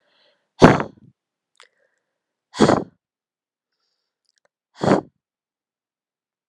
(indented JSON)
{
  "exhalation_length": "6.5 s",
  "exhalation_amplitude": 32768,
  "exhalation_signal_mean_std_ratio": 0.21,
  "survey_phase": "alpha (2021-03-01 to 2021-08-12)",
  "age": "18-44",
  "gender": "Female",
  "wearing_mask": "No",
  "symptom_none": true,
  "smoker_status": "Ex-smoker",
  "respiratory_condition_asthma": false,
  "respiratory_condition_other": false,
  "recruitment_source": "REACT",
  "submission_delay": "1 day",
  "covid_test_result": "Negative",
  "covid_test_method": "RT-qPCR"
}